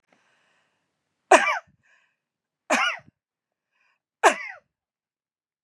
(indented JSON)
{
  "three_cough_length": "5.6 s",
  "three_cough_amplitude": 32424,
  "three_cough_signal_mean_std_ratio": 0.23,
  "survey_phase": "beta (2021-08-13 to 2022-03-07)",
  "age": "45-64",
  "gender": "Female",
  "wearing_mask": "No",
  "symptom_none": true,
  "smoker_status": "Never smoked",
  "respiratory_condition_asthma": false,
  "respiratory_condition_other": false,
  "recruitment_source": "REACT",
  "submission_delay": "1 day",
  "covid_test_result": "Negative",
  "covid_test_method": "RT-qPCR",
  "influenza_a_test_result": "Negative",
  "influenza_b_test_result": "Negative"
}